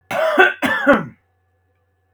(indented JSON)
{
  "cough_length": "2.1 s",
  "cough_amplitude": 32768,
  "cough_signal_mean_std_ratio": 0.49,
  "survey_phase": "beta (2021-08-13 to 2022-03-07)",
  "age": "18-44",
  "gender": "Male",
  "wearing_mask": "No",
  "symptom_none": true,
  "smoker_status": "Never smoked",
  "respiratory_condition_asthma": false,
  "respiratory_condition_other": false,
  "recruitment_source": "REACT",
  "submission_delay": "0 days",
  "covid_test_result": "Negative",
  "covid_test_method": "RT-qPCR",
  "influenza_a_test_result": "Negative",
  "influenza_b_test_result": "Negative"
}